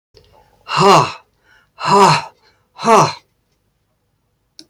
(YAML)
exhalation_length: 4.7 s
exhalation_amplitude: 32407
exhalation_signal_mean_std_ratio: 0.39
survey_phase: alpha (2021-03-01 to 2021-08-12)
age: 65+
gender: Male
wearing_mask: 'No'
symptom_none: true
smoker_status: Ex-smoker
respiratory_condition_asthma: false
respiratory_condition_other: false
recruitment_source: REACT
submission_delay: 4 days
covid_test_result: Negative
covid_test_method: RT-qPCR